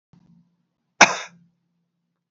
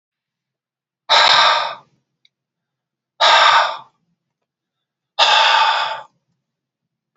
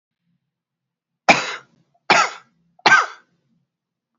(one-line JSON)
{"cough_length": "2.3 s", "cough_amplitude": 32393, "cough_signal_mean_std_ratio": 0.17, "exhalation_length": "7.2 s", "exhalation_amplitude": 31935, "exhalation_signal_mean_std_ratio": 0.43, "three_cough_length": "4.2 s", "three_cough_amplitude": 30102, "three_cough_signal_mean_std_ratio": 0.28, "survey_phase": "beta (2021-08-13 to 2022-03-07)", "age": "45-64", "gender": "Male", "wearing_mask": "No", "symptom_none": true, "smoker_status": "Never smoked", "respiratory_condition_asthma": false, "respiratory_condition_other": false, "recruitment_source": "REACT", "submission_delay": "3 days", "covid_test_result": "Negative", "covid_test_method": "RT-qPCR", "influenza_a_test_result": "Negative", "influenza_b_test_result": "Negative"}